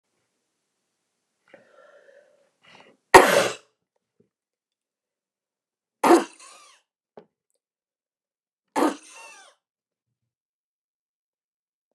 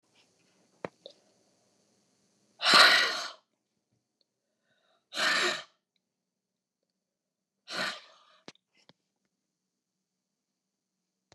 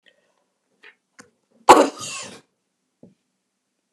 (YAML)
three_cough_length: 11.9 s
three_cough_amplitude: 29204
three_cough_signal_mean_std_ratio: 0.17
exhalation_length: 11.3 s
exhalation_amplitude: 17623
exhalation_signal_mean_std_ratio: 0.23
cough_length: 3.9 s
cough_amplitude: 29204
cough_signal_mean_std_ratio: 0.19
survey_phase: beta (2021-08-13 to 2022-03-07)
age: 65+
gender: Female
wearing_mask: 'No'
symptom_runny_or_blocked_nose: true
symptom_fatigue: true
smoker_status: Never smoked
respiratory_condition_asthma: false
respiratory_condition_other: false
recruitment_source: REACT
submission_delay: 2 days
covid_test_result: Negative
covid_test_method: RT-qPCR